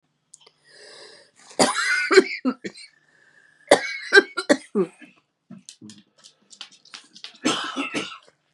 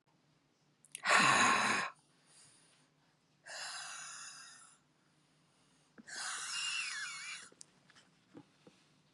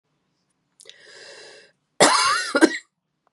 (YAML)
three_cough_length: 8.5 s
three_cough_amplitude: 32741
three_cough_signal_mean_std_ratio: 0.33
exhalation_length: 9.1 s
exhalation_amplitude: 6913
exhalation_signal_mean_std_ratio: 0.38
cough_length: 3.3 s
cough_amplitude: 31141
cough_signal_mean_std_ratio: 0.35
survey_phase: beta (2021-08-13 to 2022-03-07)
age: 45-64
gender: Female
wearing_mask: 'No'
symptom_cough_any: true
symptom_runny_or_blocked_nose: true
symptom_shortness_of_breath: true
symptom_sore_throat: true
symptom_abdominal_pain: true
symptom_fatigue: true
symptom_headache: true
smoker_status: Ex-smoker
respiratory_condition_asthma: false
respiratory_condition_other: false
recruitment_source: Test and Trace
submission_delay: 1 day
covid_test_result: Positive
covid_test_method: LFT